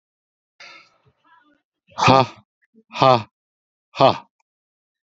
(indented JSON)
{
  "exhalation_length": "5.1 s",
  "exhalation_amplitude": 32346,
  "exhalation_signal_mean_std_ratio": 0.26,
  "survey_phase": "beta (2021-08-13 to 2022-03-07)",
  "age": "45-64",
  "gender": "Male",
  "wearing_mask": "No",
  "symptom_none": true,
  "smoker_status": "Current smoker (11 or more cigarettes per day)",
  "respiratory_condition_asthma": false,
  "respiratory_condition_other": false,
  "recruitment_source": "REACT",
  "submission_delay": "4 days",
  "covid_test_result": "Negative",
  "covid_test_method": "RT-qPCR"
}